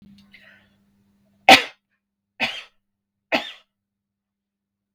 {"three_cough_length": "4.9 s", "three_cough_amplitude": 32768, "three_cough_signal_mean_std_ratio": 0.18, "survey_phase": "beta (2021-08-13 to 2022-03-07)", "age": "18-44", "gender": "Female", "wearing_mask": "No", "symptom_none": true, "smoker_status": "Never smoked", "respiratory_condition_asthma": false, "respiratory_condition_other": false, "recruitment_source": "REACT", "submission_delay": "3 days", "covid_test_result": "Negative", "covid_test_method": "RT-qPCR"}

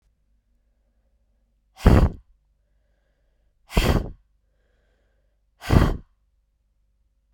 {"exhalation_length": "7.3 s", "exhalation_amplitude": 32767, "exhalation_signal_mean_std_ratio": 0.25, "survey_phase": "beta (2021-08-13 to 2022-03-07)", "age": "18-44", "gender": "Female", "wearing_mask": "No", "symptom_cough_any": true, "symptom_new_continuous_cough": true, "symptom_runny_or_blocked_nose": true, "symptom_shortness_of_breath": true, "symptom_sore_throat": true, "symptom_fatigue": true, "symptom_headache": true, "symptom_other": true, "symptom_onset": "4 days", "smoker_status": "Never smoked", "respiratory_condition_asthma": true, "respiratory_condition_other": false, "recruitment_source": "Test and Trace", "submission_delay": "2 days", "covid_test_result": "Positive", "covid_test_method": "RT-qPCR"}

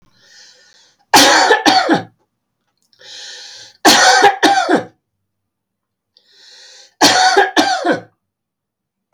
{"three_cough_length": "9.1 s", "three_cough_amplitude": 32768, "three_cough_signal_mean_std_ratio": 0.46, "survey_phase": "beta (2021-08-13 to 2022-03-07)", "age": "45-64", "gender": "Male", "wearing_mask": "No", "symptom_none": true, "smoker_status": "Never smoked", "respiratory_condition_asthma": false, "respiratory_condition_other": false, "recruitment_source": "REACT", "submission_delay": "3 days", "covid_test_result": "Negative", "covid_test_method": "RT-qPCR", "influenza_a_test_result": "Negative", "influenza_b_test_result": "Negative"}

